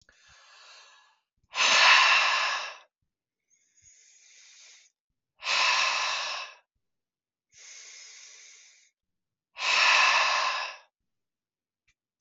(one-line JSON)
{"exhalation_length": "12.2 s", "exhalation_amplitude": 18032, "exhalation_signal_mean_std_ratio": 0.42, "survey_phase": "alpha (2021-03-01 to 2021-08-12)", "age": "45-64", "gender": "Male", "wearing_mask": "No", "symptom_cough_any": true, "smoker_status": "Never smoked", "respiratory_condition_asthma": false, "respiratory_condition_other": false, "recruitment_source": "REACT", "submission_delay": "8 days", "covid_test_result": "Negative", "covid_test_method": "RT-qPCR"}